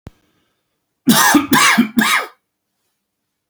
cough_length: 3.5 s
cough_amplitude: 32768
cough_signal_mean_std_ratio: 0.45
survey_phase: beta (2021-08-13 to 2022-03-07)
age: 45-64
gender: Male
wearing_mask: 'No'
symptom_other: true
smoker_status: Never smoked
respiratory_condition_asthma: false
respiratory_condition_other: false
recruitment_source: REACT
submission_delay: 2 days
covid_test_result: Negative
covid_test_method: RT-qPCR
influenza_a_test_result: Negative
influenza_b_test_result: Negative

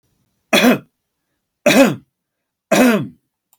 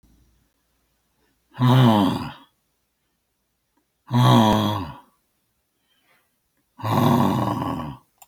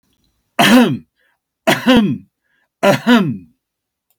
three_cough_length: 3.6 s
three_cough_amplitude: 32160
three_cough_signal_mean_std_ratio: 0.41
exhalation_length: 8.3 s
exhalation_amplitude: 22217
exhalation_signal_mean_std_ratio: 0.43
cough_length: 4.2 s
cough_amplitude: 30182
cough_signal_mean_std_ratio: 0.46
survey_phase: alpha (2021-03-01 to 2021-08-12)
age: 65+
gender: Male
wearing_mask: 'No'
symptom_none: true
smoker_status: Ex-smoker
respiratory_condition_asthma: false
respiratory_condition_other: true
recruitment_source: REACT
submission_delay: 2 days
covid_test_result: Negative
covid_test_method: RT-qPCR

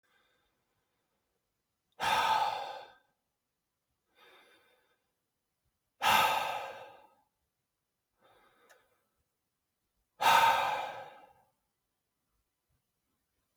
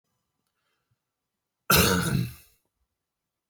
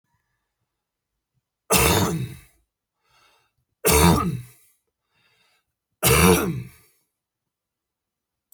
exhalation_length: 13.6 s
exhalation_amplitude: 9446
exhalation_signal_mean_std_ratio: 0.31
cough_length: 3.5 s
cough_amplitude: 15513
cough_signal_mean_std_ratio: 0.32
three_cough_length: 8.5 s
three_cough_amplitude: 25492
three_cough_signal_mean_std_ratio: 0.35
survey_phase: alpha (2021-03-01 to 2021-08-12)
age: 18-44
gender: Male
wearing_mask: 'No'
symptom_none: true
smoker_status: Never smoked
respiratory_condition_asthma: false
respiratory_condition_other: false
recruitment_source: REACT
submission_delay: 1 day
covid_test_result: Negative
covid_test_method: RT-qPCR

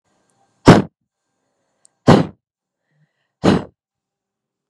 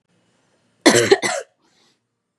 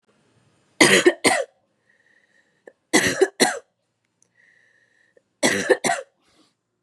exhalation_length: 4.7 s
exhalation_amplitude: 32768
exhalation_signal_mean_std_ratio: 0.24
cough_length: 2.4 s
cough_amplitude: 32767
cough_signal_mean_std_ratio: 0.32
three_cough_length: 6.8 s
three_cough_amplitude: 32768
three_cough_signal_mean_std_ratio: 0.34
survey_phase: beta (2021-08-13 to 2022-03-07)
age: 18-44
gender: Female
wearing_mask: 'No'
symptom_cough_any: true
symptom_runny_or_blocked_nose: true
symptom_shortness_of_breath: true
symptom_sore_throat: true
symptom_fatigue: true
symptom_fever_high_temperature: true
symptom_headache: true
symptom_change_to_sense_of_smell_or_taste: true
symptom_onset: 2 days
smoker_status: Never smoked
respiratory_condition_asthma: false
respiratory_condition_other: false
recruitment_source: Test and Trace
submission_delay: 1 day
covid_test_result: Negative
covid_test_method: RT-qPCR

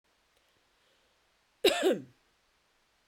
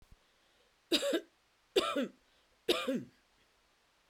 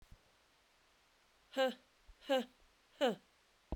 cough_length: 3.1 s
cough_amplitude: 8654
cough_signal_mean_std_ratio: 0.26
three_cough_length: 4.1 s
three_cough_amplitude: 5949
three_cough_signal_mean_std_ratio: 0.38
exhalation_length: 3.8 s
exhalation_amplitude: 2796
exhalation_signal_mean_std_ratio: 0.31
survey_phase: beta (2021-08-13 to 2022-03-07)
age: 45-64
gender: Female
wearing_mask: 'No'
symptom_runny_or_blocked_nose: true
symptom_shortness_of_breath: true
symptom_sore_throat: true
symptom_headache: true
symptom_other: true
smoker_status: Never smoked
respiratory_condition_asthma: false
respiratory_condition_other: false
recruitment_source: Test and Trace
submission_delay: 2 days
covid_test_result: Positive
covid_test_method: RT-qPCR
covid_ct_value: 21.2
covid_ct_gene: N gene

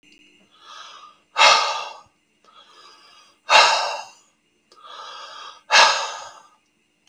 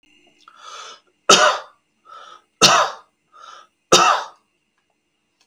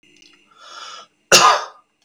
exhalation_length: 7.1 s
exhalation_amplitude: 32768
exhalation_signal_mean_std_ratio: 0.35
three_cough_length: 5.5 s
three_cough_amplitude: 32768
three_cough_signal_mean_std_ratio: 0.33
cough_length: 2.0 s
cough_amplitude: 32768
cough_signal_mean_std_ratio: 0.33
survey_phase: beta (2021-08-13 to 2022-03-07)
age: 18-44
gender: Male
wearing_mask: 'No'
symptom_none: true
smoker_status: Never smoked
respiratory_condition_asthma: false
respiratory_condition_other: false
recruitment_source: REACT
submission_delay: 2 days
covid_test_result: Negative
covid_test_method: RT-qPCR
influenza_a_test_result: Negative
influenza_b_test_result: Negative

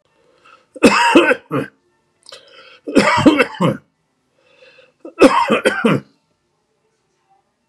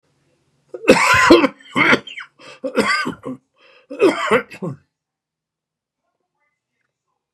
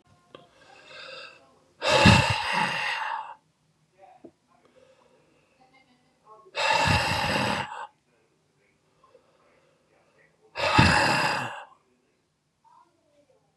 three_cough_length: 7.7 s
three_cough_amplitude: 32768
three_cough_signal_mean_std_ratio: 0.4
cough_length: 7.3 s
cough_amplitude: 32768
cough_signal_mean_std_ratio: 0.38
exhalation_length: 13.6 s
exhalation_amplitude: 25981
exhalation_signal_mean_std_ratio: 0.39
survey_phase: beta (2021-08-13 to 2022-03-07)
age: 65+
gender: Male
wearing_mask: 'No'
symptom_none: true
smoker_status: Ex-smoker
respiratory_condition_asthma: false
respiratory_condition_other: false
recruitment_source: REACT
submission_delay: 1 day
covid_test_result: Negative
covid_test_method: RT-qPCR
influenza_a_test_result: Negative
influenza_b_test_result: Negative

